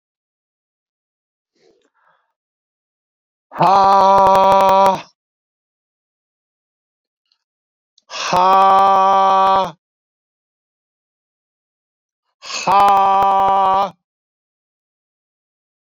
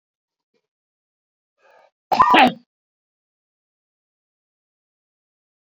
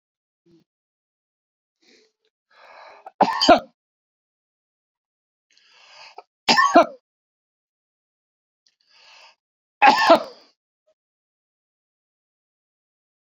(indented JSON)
{
  "exhalation_length": "15.9 s",
  "exhalation_amplitude": 29140,
  "exhalation_signal_mean_std_ratio": 0.43,
  "cough_length": "5.7 s",
  "cough_amplitude": 27824,
  "cough_signal_mean_std_ratio": 0.21,
  "three_cough_length": "13.4 s",
  "three_cough_amplitude": 28509,
  "three_cough_signal_mean_std_ratio": 0.22,
  "survey_phase": "beta (2021-08-13 to 2022-03-07)",
  "age": "45-64",
  "gender": "Male",
  "wearing_mask": "No",
  "symptom_none": true,
  "smoker_status": "Ex-smoker",
  "respiratory_condition_asthma": false,
  "respiratory_condition_other": false,
  "recruitment_source": "REACT",
  "submission_delay": "2 days",
  "covid_test_result": "Negative",
  "covid_test_method": "RT-qPCR"
}